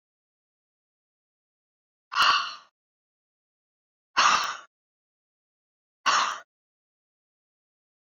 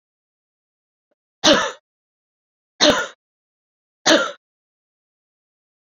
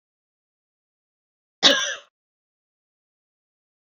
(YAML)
exhalation_length: 8.2 s
exhalation_amplitude: 14485
exhalation_signal_mean_std_ratio: 0.27
three_cough_length: 5.9 s
three_cough_amplitude: 32768
three_cough_signal_mean_std_ratio: 0.26
cough_length: 3.9 s
cough_amplitude: 31647
cough_signal_mean_std_ratio: 0.19
survey_phase: beta (2021-08-13 to 2022-03-07)
age: 65+
gender: Female
wearing_mask: 'No'
symptom_runny_or_blocked_nose: true
symptom_headache: true
smoker_status: Current smoker (e-cigarettes or vapes only)
respiratory_condition_asthma: false
respiratory_condition_other: true
recruitment_source: Test and Trace
submission_delay: 0 days
covid_test_result: Negative
covid_test_method: LFT